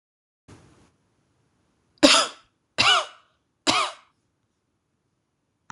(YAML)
three_cough_length: 5.7 s
three_cough_amplitude: 26027
three_cough_signal_mean_std_ratio: 0.27
survey_phase: beta (2021-08-13 to 2022-03-07)
age: 18-44
gender: Female
wearing_mask: 'No'
symptom_none: true
smoker_status: Never smoked
respiratory_condition_asthma: false
respiratory_condition_other: false
recruitment_source: REACT
submission_delay: 3 days
covid_test_result: Negative
covid_test_method: RT-qPCR